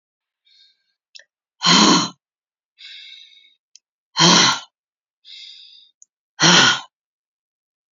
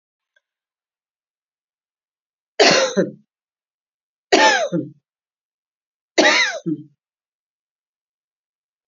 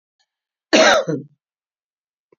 {"exhalation_length": "7.9 s", "exhalation_amplitude": 32668, "exhalation_signal_mean_std_ratio": 0.33, "three_cough_length": "8.9 s", "three_cough_amplitude": 29550, "three_cough_signal_mean_std_ratio": 0.31, "cough_length": "2.4 s", "cough_amplitude": 28069, "cough_signal_mean_std_ratio": 0.33, "survey_phase": "beta (2021-08-13 to 2022-03-07)", "age": "65+", "gender": "Female", "wearing_mask": "No", "symptom_none": true, "smoker_status": "Ex-smoker", "respiratory_condition_asthma": false, "respiratory_condition_other": false, "recruitment_source": "REACT", "submission_delay": "2 days", "covid_test_result": "Negative", "covid_test_method": "RT-qPCR"}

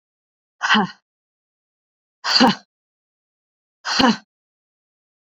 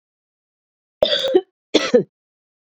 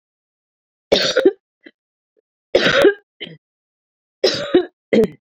{"exhalation_length": "5.3 s", "exhalation_amplitude": 27970, "exhalation_signal_mean_std_ratio": 0.3, "cough_length": "2.7 s", "cough_amplitude": 29038, "cough_signal_mean_std_ratio": 0.34, "three_cough_length": "5.4 s", "three_cough_amplitude": 29246, "three_cough_signal_mean_std_ratio": 0.38, "survey_phase": "beta (2021-08-13 to 2022-03-07)", "age": "45-64", "gender": "Female", "wearing_mask": "No", "symptom_none": true, "smoker_status": "Ex-smoker", "respiratory_condition_asthma": true, "respiratory_condition_other": false, "recruitment_source": "REACT", "submission_delay": "1 day", "covid_test_result": "Negative", "covid_test_method": "RT-qPCR", "influenza_a_test_result": "Negative", "influenza_b_test_result": "Negative"}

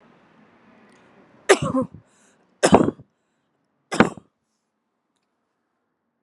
{"three_cough_length": "6.2 s", "three_cough_amplitude": 32768, "three_cough_signal_mean_std_ratio": 0.23, "survey_phase": "beta (2021-08-13 to 2022-03-07)", "age": "18-44", "gender": "Female", "wearing_mask": "No", "symptom_cough_any": true, "symptom_new_continuous_cough": true, "smoker_status": "Never smoked", "respiratory_condition_asthma": false, "respiratory_condition_other": false, "recruitment_source": "REACT", "submission_delay": "0 days", "covid_test_result": "Negative", "covid_test_method": "RT-qPCR", "influenza_a_test_result": "Negative", "influenza_b_test_result": "Negative"}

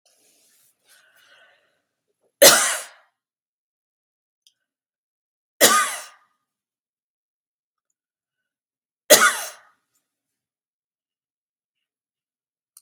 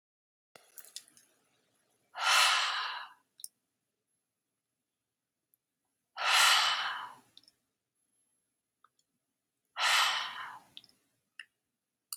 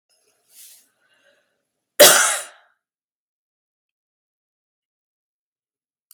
{"three_cough_length": "12.8 s", "three_cough_amplitude": 32768, "three_cough_signal_mean_std_ratio": 0.2, "exhalation_length": "12.2 s", "exhalation_amplitude": 8912, "exhalation_signal_mean_std_ratio": 0.34, "cough_length": "6.1 s", "cough_amplitude": 32768, "cough_signal_mean_std_ratio": 0.19, "survey_phase": "beta (2021-08-13 to 2022-03-07)", "age": "45-64", "gender": "Female", "wearing_mask": "No", "symptom_none": true, "smoker_status": "Never smoked", "respiratory_condition_asthma": false, "respiratory_condition_other": false, "recruitment_source": "REACT", "submission_delay": "1 day", "covid_test_result": "Negative", "covid_test_method": "RT-qPCR"}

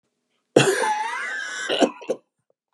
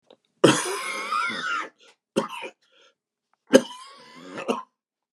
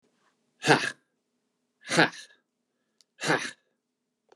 {"cough_length": "2.7 s", "cough_amplitude": 30590, "cough_signal_mean_std_ratio": 0.51, "three_cough_length": "5.1 s", "three_cough_amplitude": 32767, "three_cough_signal_mean_std_ratio": 0.36, "exhalation_length": "4.4 s", "exhalation_amplitude": 17047, "exhalation_signal_mean_std_ratio": 0.28, "survey_phase": "beta (2021-08-13 to 2022-03-07)", "age": "45-64", "gender": "Male", "wearing_mask": "No", "symptom_cough_any": true, "smoker_status": "Never smoked", "respiratory_condition_asthma": false, "respiratory_condition_other": false, "recruitment_source": "REACT", "submission_delay": "0 days", "covid_test_result": "Negative", "covid_test_method": "RT-qPCR"}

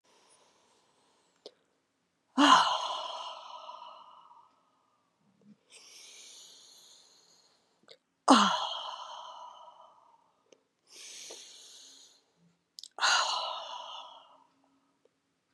{"exhalation_length": "15.5 s", "exhalation_amplitude": 14676, "exhalation_signal_mean_std_ratio": 0.29, "survey_phase": "beta (2021-08-13 to 2022-03-07)", "age": "65+", "gender": "Female", "wearing_mask": "No", "symptom_none": true, "smoker_status": "Never smoked", "respiratory_condition_asthma": true, "respiratory_condition_other": false, "recruitment_source": "REACT", "submission_delay": "3 days", "covid_test_result": "Negative", "covid_test_method": "RT-qPCR", "influenza_a_test_result": "Unknown/Void", "influenza_b_test_result": "Unknown/Void"}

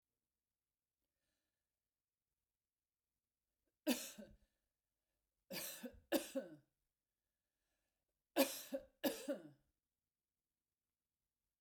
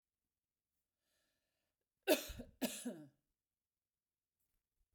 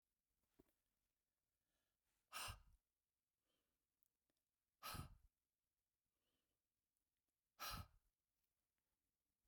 {"three_cough_length": "11.6 s", "three_cough_amplitude": 3164, "three_cough_signal_mean_std_ratio": 0.24, "cough_length": "4.9 s", "cough_amplitude": 4343, "cough_signal_mean_std_ratio": 0.21, "exhalation_length": "9.5 s", "exhalation_amplitude": 332, "exhalation_signal_mean_std_ratio": 0.25, "survey_phase": "beta (2021-08-13 to 2022-03-07)", "age": "45-64", "gender": "Female", "wearing_mask": "No", "symptom_none": true, "symptom_onset": "2 days", "smoker_status": "Ex-smoker", "respiratory_condition_asthma": false, "respiratory_condition_other": false, "recruitment_source": "REACT", "submission_delay": "2 days", "covid_test_result": "Negative", "covid_test_method": "RT-qPCR", "influenza_a_test_result": "Negative", "influenza_b_test_result": "Negative"}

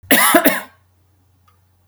{"cough_length": "1.9 s", "cough_amplitude": 32768, "cough_signal_mean_std_ratio": 0.41, "survey_phase": "beta (2021-08-13 to 2022-03-07)", "age": "45-64", "gender": "Female", "wearing_mask": "No", "symptom_none": true, "smoker_status": "Never smoked", "respiratory_condition_asthma": false, "respiratory_condition_other": false, "recruitment_source": "REACT", "submission_delay": "2 days", "covid_test_result": "Negative", "covid_test_method": "RT-qPCR", "influenza_a_test_result": "Negative", "influenza_b_test_result": "Negative"}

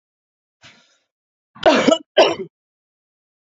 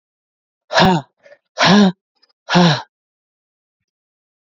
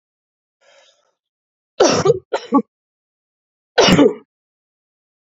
{"cough_length": "3.4 s", "cough_amplitude": 28069, "cough_signal_mean_std_ratio": 0.3, "exhalation_length": "4.5 s", "exhalation_amplitude": 30189, "exhalation_signal_mean_std_ratio": 0.37, "three_cough_length": "5.3 s", "three_cough_amplitude": 31886, "three_cough_signal_mean_std_ratio": 0.32, "survey_phase": "beta (2021-08-13 to 2022-03-07)", "age": "18-44", "gender": "Female", "wearing_mask": "No", "symptom_cough_any": true, "symptom_runny_or_blocked_nose": true, "symptom_sore_throat": true, "symptom_diarrhoea": true, "symptom_fatigue": true, "symptom_headache": true, "symptom_change_to_sense_of_smell_or_taste": true, "symptom_loss_of_taste": true, "smoker_status": "Current smoker (1 to 10 cigarettes per day)", "respiratory_condition_asthma": false, "respiratory_condition_other": false, "recruitment_source": "Test and Trace", "submission_delay": "1 day", "covid_test_result": "Positive", "covid_test_method": "RT-qPCR"}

